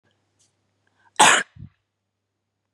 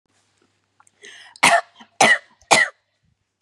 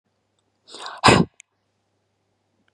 {"cough_length": "2.7 s", "cough_amplitude": 30738, "cough_signal_mean_std_ratio": 0.23, "three_cough_length": "3.4 s", "three_cough_amplitude": 32767, "three_cough_signal_mean_std_ratio": 0.32, "exhalation_length": "2.7 s", "exhalation_amplitude": 32427, "exhalation_signal_mean_std_ratio": 0.23, "survey_phase": "beta (2021-08-13 to 2022-03-07)", "age": "18-44", "gender": "Female", "wearing_mask": "No", "symptom_none": true, "smoker_status": "Never smoked", "respiratory_condition_asthma": false, "respiratory_condition_other": false, "recruitment_source": "REACT", "submission_delay": "1 day", "covid_test_result": "Negative", "covid_test_method": "RT-qPCR", "influenza_a_test_result": "Negative", "influenza_b_test_result": "Negative"}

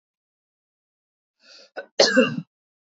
{"cough_length": "2.8 s", "cough_amplitude": 27508, "cough_signal_mean_std_ratio": 0.27, "survey_phase": "beta (2021-08-13 to 2022-03-07)", "age": "45-64", "gender": "Female", "wearing_mask": "No", "symptom_none": true, "symptom_onset": "11 days", "smoker_status": "Never smoked", "respiratory_condition_asthma": false, "respiratory_condition_other": false, "recruitment_source": "REACT", "submission_delay": "2 days", "covid_test_result": "Negative", "covid_test_method": "RT-qPCR", "influenza_a_test_result": "Negative", "influenza_b_test_result": "Negative"}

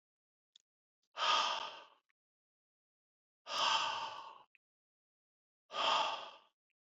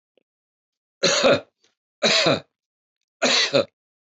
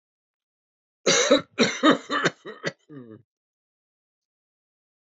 {"exhalation_length": "7.0 s", "exhalation_amplitude": 3126, "exhalation_signal_mean_std_ratio": 0.39, "three_cough_length": "4.2 s", "three_cough_amplitude": 17421, "three_cough_signal_mean_std_ratio": 0.42, "cough_length": "5.1 s", "cough_amplitude": 18198, "cough_signal_mean_std_ratio": 0.33, "survey_phase": "beta (2021-08-13 to 2022-03-07)", "age": "65+", "gender": "Male", "wearing_mask": "No", "symptom_cough_any": true, "symptom_runny_or_blocked_nose": true, "symptom_fatigue": true, "smoker_status": "Never smoked", "respiratory_condition_asthma": false, "respiratory_condition_other": false, "recruitment_source": "Test and Trace", "submission_delay": "1 day", "covid_test_result": "Positive", "covid_test_method": "RT-qPCR", "covid_ct_value": 18.4, "covid_ct_gene": "ORF1ab gene", "covid_ct_mean": 19.6, "covid_viral_load": "370000 copies/ml", "covid_viral_load_category": "Low viral load (10K-1M copies/ml)"}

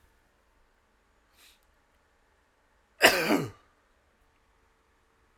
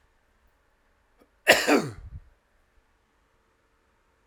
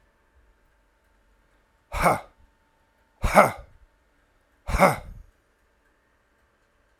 {"three_cough_length": "5.4 s", "three_cough_amplitude": 20115, "three_cough_signal_mean_std_ratio": 0.21, "cough_length": "4.3 s", "cough_amplitude": 24175, "cough_signal_mean_std_ratio": 0.23, "exhalation_length": "7.0 s", "exhalation_amplitude": 32767, "exhalation_signal_mean_std_ratio": 0.24, "survey_phase": "alpha (2021-03-01 to 2021-08-12)", "age": "45-64", "gender": "Male", "wearing_mask": "No", "symptom_cough_any": true, "symptom_fatigue": true, "symptom_fever_high_temperature": true, "symptom_headache": true, "smoker_status": "Current smoker (1 to 10 cigarettes per day)", "respiratory_condition_asthma": false, "respiratory_condition_other": true, "recruitment_source": "Test and Trace", "submission_delay": "2 days", "covid_test_result": "Positive", "covid_test_method": "RT-qPCR", "covid_ct_value": 20.7, "covid_ct_gene": "ORF1ab gene", "covid_ct_mean": 21.7, "covid_viral_load": "74000 copies/ml", "covid_viral_load_category": "Low viral load (10K-1M copies/ml)"}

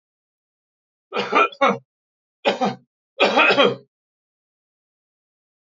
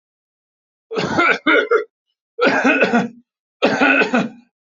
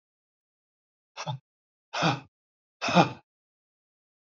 {"three_cough_length": "5.7 s", "three_cough_amplitude": 26921, "three_cough_signal_mean_std_ratio": 0.36, "cough_length": "4.8 s", "cough_amplitude": 29499, "cough_signal_mean_std_ratio": 0.56, "exhalation_length": "4.4 s", "exhalation_amplitude": 17817, "exhalation_signal_mean_std_ratio": 0.26, "survey_phase": "alpha (2021-03-01 to 2021-08-12)", "age": "45-64", "gender": "Male", "wearing_mask": "No", "symptom_none": true, "smoker_status": "Ex-smoker", "respiratory_condition_asthma": false, "respiratory_condition_other": false, "recruitment_source": "REACT", "submission_delay": "1 day", "covid_test_result": "Negative", "covid_test_method": "RT-qPCR"}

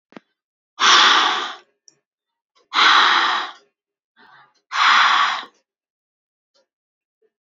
{"exhalation_length": "7.4 s", "exhalation_amplitude": 30283, "exhalation_signal_mean_std_ratio": 0.43, "survey_phase": "beta (2021-08-13 to 2022-03-07)", "age": "18-44", "gender": "Female", "wearing_mask": "No", "symptom_none": true, "smoker_status": "Never smoked", "respiratory_condition_asthma": true, "respiratory_condition_other": false, "recruitment_source": "REACT", "submission_delay": "7 days", "covid_test_result": "Negative", "covid_test_method": "RT-qPCR", "influenza_a_test_result": "Negative", "influenza_b_test_result": "Negative"}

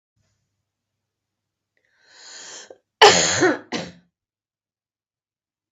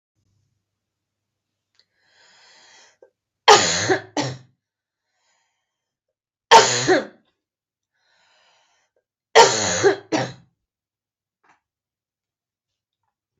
{"cough_length": "5.7 s", "cough_amplitude": 32768, "cough_signal_mean_std_ratio": 0.24, "three_cough_length": "13.4 s", "three_cough_amplitude": 32768, "three_cough_signal_mean_std_ratio": 0.25, "survey_phase": "beta (2021-08-13 to 2022-03-07)", "age": "45-64", "gender": "Female", "wearing_mask": "No", "symptom_none": true, "smoker_status": "Never smoked", "respiratory_condition_asthma": false, "respiratory_condition_other": false, "recruitment_source": "REACT", "submission_delay": "1 day", "covid_test_result": "Negative", "covid_test_method": "RT-qPCR", "influenza_a_test_result": "Negative", "influenza_b_test_result": "Negative"}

